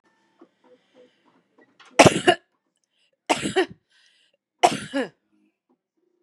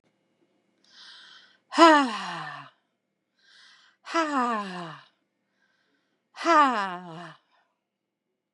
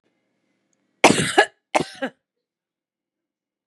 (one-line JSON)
{"three_cough_length": "6.2 s", "three_cough_amplitude": 32768, "three_cough_signal_mean_std_ratio": 0.24, "exhalation_length": "8.5 s", "exhalation_amplitude": 26894, "exhalation_signal_mean_std_ratio": 0.3, "cough_length": "3.7 s", "cough_amplitude": 32768, "cough_signal_mean_std_ratio": 0.25, "survey_phase": "beta (2021-08-13 to 2022-03-07)", "age": "45-64", "gender": "Female", "wearing_mask": "No", "symptom_none": true, "smoker_status": "Ex-smoker", "respiratory_condition_asthma": false, "respiratory_condition_other": false, "recruitment_source": "REACT", "submission_delay": "1 day", "covid_test_result": "Negative", "covid_test_method": "RT-qPCR", "influenza_a_test_result": "Negative", "influenza_b_test_result": "Negative"}